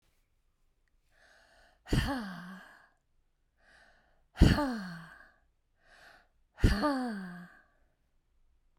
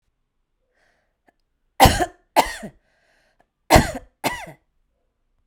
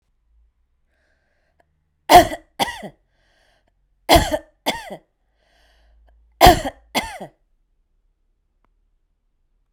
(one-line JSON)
{"exhalation_length": "8.8 s", "exhalation_amplitude": 12718, "exhalation_signal_mean_std_ratio": 0.31, "cough_length": "5.5 s", "cough_amplitude": 32768, "cough_signal_mean_std_ratio": 0.25, "three_cough_length": "9.7 s", "three_cough_amplitude": 32768, "three_cough_signal_mean_std_ratio": 0.22, "survey_phase": "beta (2021-08-13 to 2022-03-07)", "age": "65+", "gender": "Female", "wearing_mask": "No", "symptom_runny_or_blocked_nose": true, "smoker_status": "Ex-smoker", "respiratory_condition_asthma": false, "respiratory_condition_other": false, "recruitment_source": "REACT", "submission_delay": "2 days", "covid_test_result": "Negative", "covid_test_method": "RT-qPCR"}